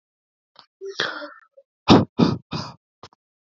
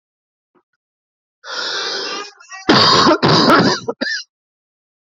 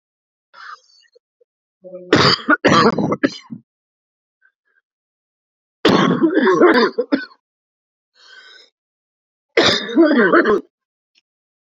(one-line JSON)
{"exhalation_length": "3.6 s", "exhalation_amplitude": 28126, "exhalation_signal_mean_std_ratio": 0.29, "cough_length": "5.0 s", "cough_amplitude": 30002, "cough_signal_mean_std_ratio": 0.49, "three_cough_length": "11.7 s", "three_cough_amplitude": 31358, "three_cough_signal_mean_std_ratio": 0.43, "survey_phase": "alpha (2021-03-01 to 2021-08-12)", "age": "18-44", "gender": "Male", "wearing_mask": "No", "symptom_new_continuous_cough": true, "symptom_headache": true, "symptom_onset": "4 days", "smoker_status": "Never smoked", "respiratory_condition_asthma": false, "respiratory_condition_other": false, "recruitment_source": "Test and Trace", "submission_delay": "2 days", "covid_test_result": "Positive", "covid_test_method": "RT-qPCR", "covid_ct_value": 21.6, "covid_ct_gene": "ORF1ab gene"}